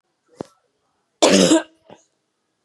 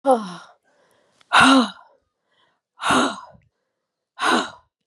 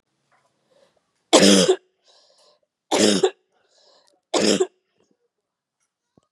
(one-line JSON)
{"cough_length": "2.6 s", "cough_amplitude": 29971, "cough_signal_mean_std_ratio": 0.32, "exhalation_length": "4.9 s", "exhalation_amplitude": 27981, "exhalation_signal_mean_std_ratio": 0.38, "three_cough_length": "6.3 s", "three_cough_amplitude": 32767, "three_cough_signal_mean_std_ratio": 0.32, "survey_phase": "beta (2021-08-13 to 2022-03-07)", "age": "45-64", "gender": "Female", "wearing_mask": "No", "symptom_cough_any": true, "symptom_runny_or_blocked_nose": true, "symptom_fatigue": true, "symptom_headache": true, "symptom_onset": "4 days", "smoker_status": "Never smoked", "respiratory_condition_asthma": false, "respiratory_condition_other": false, "recruitment_source": "Test and Trace", "submission_delay": "1 day", "covid_test_result": "Positive", "covid_test_method": "ePCR"}